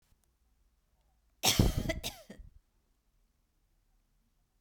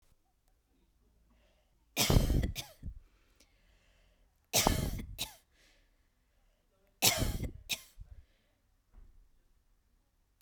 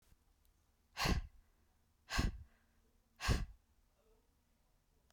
{"cough_length": "4.6 s", "cough_amplitude": 9427, "cough_signal_mean_std_ratio": 0.26, "three_cough_length": "10.4 s", "three_cough_amplitude": 9320, "three_cough_signal_mean_std_ratio": 0.32, "exhalation_length": "5.1 s", "exhalation_amplitude": 2723, "exhalation_signal_mean_std_ratio": 0.32, "survey_phase": "beta (2021-08-13 to 2022-03-07)", "age": "18-44", "gender": "Female", "wearing_mask": "No", "symptom_none": true, "smoker_status": "Never smoked", "respiratory_condition_asthma": false, "respiratory_condition_other": false, "recruitment_source": "REACT", "submission_delay": "1 day", "covid_test_result": "Negative", "covid_test_method": "RT-qPCR"}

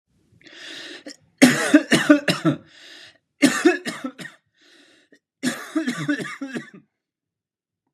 {"three_cough_length": "7.9 s", "three_cough_amplitude": 32767, "three_cough_signal_mean_std_ratio": 0.37, "survey_phase": "beta (2021-08-13 to 2022-03-07)", "age": "18-44", "gender": "Male", "wearing_mask": "No", "symptom_none": true, "smoker_status": "Never smoked", "respiratory_condition_asthma": false, "respiratory_condition_other": false, "recruitment_source": "REACT", "submission_delay": "1 day", "covid_test_result": "Negative", "covid_test_method": "RT-qPCR", "influenza_a_test_result": "Negative", "influenza_b_test_result": "Negative"}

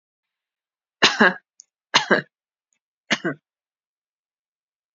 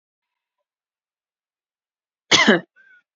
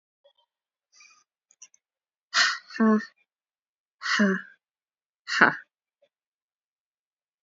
{"three_cough_length": "4.9 s", "three_cough_amplitude": 28399, "three_cough_signal_mean_std_ratio": 0.24, "cough_length": "3.2 s", "cough_amplitude": 30121, "cough_signal_mean_std_ratio": 0.23, "exhalation_length": "7.4 s", "exhalation_amplitude": 27344, "exhalation_signal_mean_std_ratio": 0.29, "survey_phase": "beta (2021-08-13 to 2022-03-07)", "age": "18-44", "gender": "Female", "wearing_mask": "No", "symptom_none": true, "smoker_status": "Never smoked", "respiratory_condition_asthma": false, "respiratory_condition_other": false, "recruitment_source": "REACT", "submission_delay": "7 days", "covid_test_result": "Negative", "covid_test_method": "RT-qPCR", "influenza_a_test_result": "Negative", "influenza_b_test_result": "Negative"}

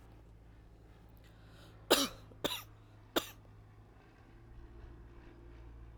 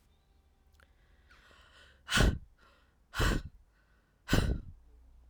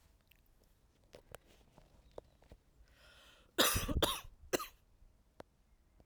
{"three_cough_length": "6.0 s", "three_cough_amplitude": 9298, "three_cough_signal_mean_std_ratio": 0.34, "exhalation_length": "5.3 s", "exhalation_amplitude": 8583, "exhalation_signal_mean_std_ratio": 0.34, "cough_length": "6.1 s", "cough_amplitude": 5400, "cough_signal_mean_std_ratio": 0.3, "survey_phase": "alpha (2021-03-01 to 2021-08-12)", "age": "18-44", "gender": "Female", "wearing_mask": "No", "symptom_none": true, "smoker_status": "Current smoker (1 to 10 cigarettes per day)", "respiratory_condition_asthma": false, "respiratory_condition_other": false, "recruitment_source": "REACT", "submission_delay": "4 days", "covid_test_result": "Negative", "covid_test_method": "RT-qPCR"}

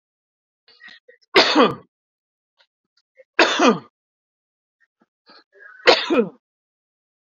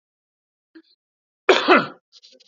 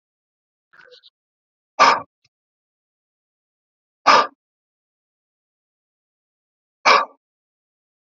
{"three_cough_length": "7.3 s", "three_cough_amplitude": 32767, "three_cough_signal_mean_std_ratio": 0.29, "cough_length": "2.5 s", "cough_amplitude": 27369, "cough_signal_mean_std_ratio": 0.28, "exhalation_length": "8.2 s", "exhalation_amplitude": 30531, "exhalation_signal_mean_std_ratio": 0.2, "survey_phase": "beta (2021-08-13 to 2022-03-07)", "age": "45-64", "gender": "Male", "wearing_mask": "No", "symptom_none": true, "smoker_status": "Current smoker (e-cigarettes or vapes only)", "respiratory_condition_asthma": false, "respiratory_condition_other": false, "recruitment_source": "REACT", "submission_delay": "6 days", "covid_test_result": "Negative", "covid_test_method": "RT-qPCR", "influenza_a_test_result": "Negative", "influenza_b_test_result": "Negative"}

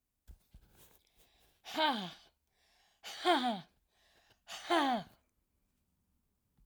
{"exhalation_length": "6.7 s", "exhalation_amplitude": 3904, "exhalation_signal_mean_std_ratio": 0.35, "survey_phase": "alpha (2021-03-01 to 2021-08-12)", "age": "65+", "gender": "Female", "wearing_mask": "No", "symptom_none": true, "smoker_status": "Never smoked", "respiratory_condition_asthma": true, "respiratory_condition_other": false, "recruitment_source": "REACT", "submission_delay": "1 day", "covid_test_result": "Negative", "covid_test_method": "RT-qPCR"}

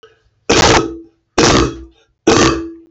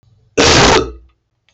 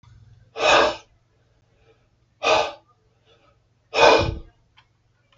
{"three_cough_length": "2.9 s", "three_cough_amplitude": 32768, "three_cough_signal_mean_std_ratio": 0.57, "cough_length": "1.5 s", "cough_amplitude": 32768, "cough_signal_mean_std_ratio": 0.54, "exhalation_length": "5.4 s", "exhalation_amplitude": 28929, "exhalation_signal_mean_std_ratio": 0.35, "survey_phase": "beta (2021-08-13 to 2022-03-07)", "age": "45-64", "gender": "Male", "wearing_mask": "No", "symptom_none": true, "symptom_onset": "7 days", "smoker_status": "Never smoked", "respiratory_condition_asthma": false, "respiratory_condition_other": true, "recruitment_source": "Test and Trace", "submission_delay": "4 days", "covid_test_result": "Negative", "covid_test_method": "RT-qPCR"}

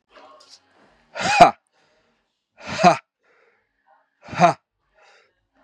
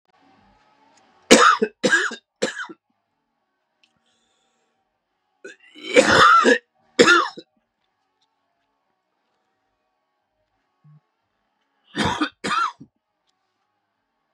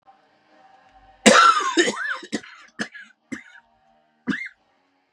{"exhalation_length": "5.6 s", "exhalation_amplitude": 32768, "exhalation_signal_mean_std_ratio": 0.25, "three_cough_length": "14.3 s", "three_cough_amplitude": 32768, "three_cough_signal_mean_std_ratio": 0.29, "cough_length": "5.1 s", "cough_amplitude": 32767, "cough_signal_mean_std_ratio": 0.34, "survey_phase": "beta (2021-08-13 to 2022-03-07)", "age": "45-64", "gender": "Male", "wearing_mask": "No", "symptom_cough_any": true, "symptom_new_continuous_cough": true, "symptom_runny_or_blocked_nose": true, "symptom_sore_throat": true, "symptom_diarrhoea": true, "symptom_fatigue": true, "symptom_headache": true, "symptom_onset": "3 days", "smoker_status": "Never smoked", "respiratory_condition_asthma": false, "respiratory_condition_other": false, "recruitment_source": "Test and Trace", "submission_delay": "2 days", "covid_test_result": "Positive", "covid_test_method": "RT-qPCR"}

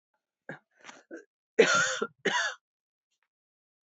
{"cough_length": "3.8 s", "cough_amplitude": 13376, "cough_signal_mean_std_ratio": 0.33, "survey_phase": "beta (2021-08-13 to 2022-03-07)", "age": "65+", "gender": "Female", "wearing_mask": "No", "symptom_cough_any": true, "symptom_runny_or_blocked_nose": true, "symptom_sore_throat": true, "symptom_fatigue": true, "symptom_headache": true, "symptom_other": true, "symptom_onset": "3 days", "smoker_status": "Never smoked", "respiratory_condition_asthma": false, "respiratory_condition_other": false, "recruitment_source": "Test and Trace", "submission_delay": "2 days", "covid_test_result": "Positive", "covid_test_method": "RT-qPCR", "covid_ct_value": 18.5, "covid_ct_gene": "ORF1ab gene"}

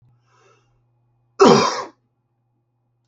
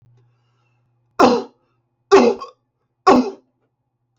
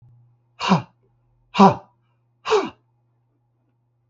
{"cough_length": "3.1 s", "cough_amplitude": 27469, "cough_signal_mean_std_ratio": 0.27, "three_cough_length": "4.2 s", "three_cough_amplitude": 32441, "three_cough_signal_mean_std_ratio": 0.33, "exhalation_length": "4.1 s", "exhalation_amplitude": 28757, "exhalation_signal_mean_std_ratio": 0.28, "survey_phase": "beta (2021-08-13 to 2022-03-07)", "age": "65+", "gender": "Male", "wearing_mask": "No", "symptom_none": true, "smoker_status": "Never smoked", "respiratory_condition_asthma": false, "respiratory_condition_other": false, "recruitment_source": "REACT", "submission_delay": "1 day", "covid_test_result": "Negative", "covid_test_method": "RT-qPCR"}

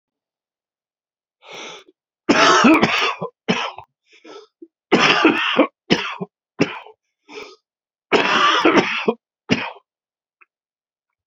{"three_cough_length": "11.3 s", "three_cough_amplitude": 32767, "three_cough_signal_mean_std_ratio": 0.43, "survey_phase": "beta (2021-08-13 to 2022-03-07)", "age": "65+", "gender": "Male", "wearing_mask": "No", "symptom_cough_any": true, "symptom_runny_or_blocked_nose": true, "symptom_fatigue": true, "symptom_change_to_sense_of_smell_or_taste": true, "symptom_onset": "4 days", "smoker_status": "Never smoked", "respiratory_condition_asthma": false, "respiratory_condition_other": true, "recruitment_source": "Test and Trace", "submission_delay": "2 days", "covid_test_result": "Positive", "covid_test_method": "RT-qPCR", "covid_ct_value": 24.6, "covid_ct_gene": "N gene"}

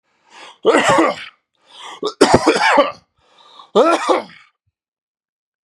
{"three_cough_length": "5.6 s", "three_cough_amplitude": 32768, "three_cough_signal_mean_std_ratio": 0.45, "survey_phase": "beta (2021-08-13 to 2022-03-07)", "age": "18-44", "gender": "Male", "wearing_mask": "No", "symptom_none": true, "smoker_status": "Never smoked", "respiratory_condition_asthma": false, "respiratory_condition_other": true, "recruitment_source": "REACT", "submission_delay": "0 days", "covid_test_result": "Negative", "covid_test_method": "RT-qPCR", "influenza_a_test_result": "Negative", "influenza_b_test_result": "Negative"}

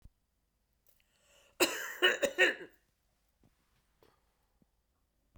{"cough_length": "5.4 s", "cough_amplitude": 8096, "cough_signal_mean_std_ratio": 0.27, "survey_phase": "beta (2021-08-13 to 2022-03-07)", "age": "65+", "gender": "Female", "wearing_mask": "No", "symptom_none": true, "smoker_status": "Never smoked", "respiratory_condition_asthma": false, "respiratory_condition_other": false, "recruitment_source": "REACT", "submission_delay": "1 day", "covid_test_result": "Negative", "covid_test_method": "RT-qPCR", "influenza_a_test_result": "Negative", "influenza_b_test_result": "Negative"}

